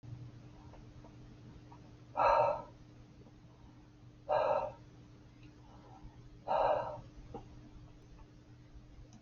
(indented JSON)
{
  "exhalation_length": "9.2 s",
  "exhalation_amplitude": 4285,
  "exhalation_signal_mean_std_ratio": 0.43,
  "survey_phase": "alpha (2021-03-01 to 2021-08-12)",
  "age": "65+",
  "gender": "Female",
  "wearing_mask": "No",
  "symptom_none": true,
  "smoker_status": "Ex-smoker",
  "respiratory_condition_asthma": false,
  "respiratory_condition_other": false,
  "recruitment_source": "REACT",
  "submission_delay": "2 days",
  "covid_test_result": "Negative",
  "covid_test_method": "RT-qPCR"
}